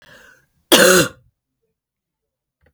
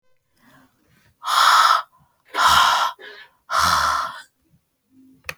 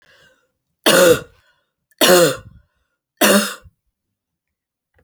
{"cough_length": "2.7 s", "cough_amplitude": 32768, "cough_signal_mean_std_ratio": 0.3, "exhalation_length": "5.4 s", "exhalation_amplitude": 25102, "exhalation_signal_mean_std_ratio": 0.48, "three_cough_length": "5.0 s", "three_cough_amplitude": 32768, "three_cough_signal_mean_std_ratio": 0.36, "survey_phase": "alpha (2021-03-01 to 2021-08-12)", "age": "18-44", "gender": "Female", "wearing_mask": "No", "symptom_cough_any": true, "symptom_new_continuous_cough": true, "symptom_shortness_of_breath": true, "symptom_abdominal_pain": true, "symptom_diarrhoea": true, "symptom_fatigue": true, "symptom_headache": true, "symptom_change_to_sense_of_smell_or_taste": true, "symptom_loss_of_taste": true, "symptom_onset": "5 days", "smoker_status": "Ex-smoker", "respiratory_condition_asthma": false, "respiratory_condition_other": false, "recruitment_source": "Test and Trace", "submission_delay": "2 days", "covid_test_result": "Positive", "covid_test_method": "RT-qPCR", "covid_ct_value": 13.9, "covid_ct_gene": "ORF1ab gene", "covid_ct_mean": 14.2, "covid_viral_load": "21000000 copies/ml", "covid_viral_load_category": "High viral load (>1M copies/ml)"}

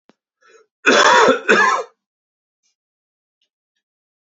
{"cough_length": "4.3 s", "cough_amplitude": 29267, "cough_signal_mean_std_ratio": 0.37, "survey_phase": "beta (2021-08-13 to 2022-03-07)", "age": "18-44", "gender": "Male", "wearing_mask": "No", "symptom_cough_any": true, "symptom_runny_or_blocked_nose": true, "symptom_fatigue": true, "symptom_other": true, "smoker_status": "Never smoked", "respiratory_condition_asthma": false, "respiratory_condition_other": false, "recruitment_source": "Test and Trace", "submission_delay": "2 days", "covid_test_result": "Positive", "covid_test_method": "ePCR"}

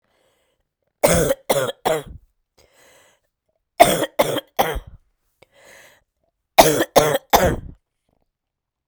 {"three_cough_length": "8.9 s", "three_cough_amplitude": 32768, "three_cough_signal_mean_std_ratio": 0.35, "survey_phase": "beta (2021-08-13 to 2022-03-07)", "age": "45-64", "gender": "Female", "wearing_mask": "No", "symptom_cough_any": true, "symptom_new_continuous_cough": true, "symptom_runny_or_blocked_nose": true, "symptom_shortness_of_breath": true, "symptom_sore_throat": true, "symptom_fatigue": true, "symptom_fever_high_temperature": true, "symptom_headache": true, "symptom_change_to_sense_of_smell_or_taste": true, "symptom_other": true, "symptom_onset": "3 days", "smoker_status": "Never smoked", "respiratory_condition_asthma": false, "respiratory_condition_other": false, "recruitment_source": "Test and Trace", "submission_delay": "2 days", "covid_test_result": "Positive", "covid_test_method": "RT-qPCR", "covid_ct_value": 26.8, "covid_ct_gene": "N gene"}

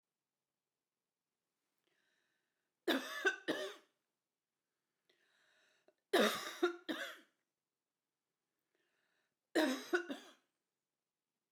{"three_cough_length": "11.5 s", "three_cough_amplitude": 3448, "three_cough_signal_mean_std_ratio": 0.29, "survey_phase": "beta (2021-08-13 to 2022-03-07)", "age": "65+", "gender": "Female", "wearing_mask": "No", "symptom_none": true, "smoker_status": "Ex-smoker", "respiratory_condition_asthma": false, "respiratory_condition_other": false, "recruitment_source": "REACT", "submission_delay": "1 day", "covid_test_result": "Negative", "covid_test_method": "RT-qPCR", "influenza_a_test_result": "Negative", "influenza_b_test_result": "Negative"}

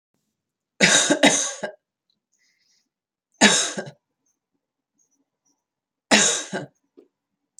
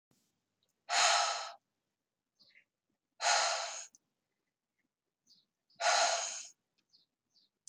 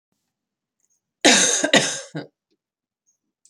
{"three_cough_length": "7.6 s", "three_cough_amplitude": 29933, "three_cough_signal_mean_std_ratio": 0.32, "exhalation_length": "7.7 s", "exhalation_amplitude": 5283, "exhalation_signal_mean_std_ratio": 0.37, "cough_length": "3.5 s", "cough_amplitude": 31656, "cough_signal_mean_std_ratio": 0.34, "survey_phase": "alpha (2021-03-01 to 2021-08-12)", "age": "45-64", "gender": "Female", "wearing_mask": "No", "symptom_none": true, "smoker_status": "Ex-smoker", "respiratory_condition_asthma": false, "respiratory_condition_other": false, "recruitment_source": "REACT", "submission_delay": "1 day", "covid_test_result": "Negative", "covid_test_method": "RT-qPCR"}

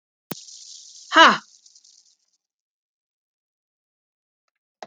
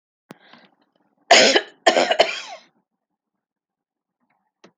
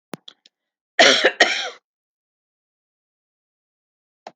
{"exhalation_length": "4.9 s", "exhalation_amplitude": 29279, "exhalation_signal_mean_std_ratio": 0.18, "three_cough_length": "4.8 s", "three_cough_amplitude": 32767, "three_cough_signal_mean_std_ratio": 0.29, "cough_length": "4.4 s", "cough_amplitude": 29953, "cough_signal_mean_std_ratio": 0.26, "survey_phase": "alpha (2021-03-01 to 2021-08-12)", "age": "45-64", "gender": "Female", "wearing_mask": "No", "symptom_none": true, "smoker_status": "Never smoked", "respiratory_condition_asthma": true, "respiratory_condition_other": false, "recruitment_source": "REACT", "submission_delay": "22 days", "covid_test_result": "Negative", "covid_test_method": "RT-qPCR"}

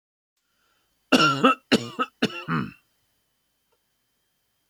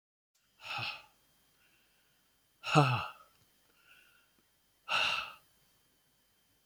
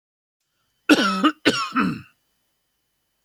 {"three_cough_length": "4.7 s", "three_cough_amplitude": 24531, "three_cough_signal_mean_std_ratio": 0.32, "exhalation_length": "6.7 s", "exhalation_amplitude": 9902, "exhalation_signal_mean_std_ratio": 0.29, "cough_length": "3.2 s", "cough_amplitude": 27722, "cough_signal_mean_std_ratio": 0.38, "survey_phase": "beta (2021-08-13 to 2022-03-07)", "age": "45-64", "gender": "Male", "wearing_mask": "No", "symptom_none": true, "smoker_status": "Ex-smoker", "respiratory_condition_asthma": false, "respiratory_condition_other": false, "recruitment_source": "REACT", "submission_delay": "1 day", "covid_test_result": "Negative", "covid_test_method": "RT-qPCR", "influenza_a_test_result": "Negative", "influenza_b_test_result": "Negative"}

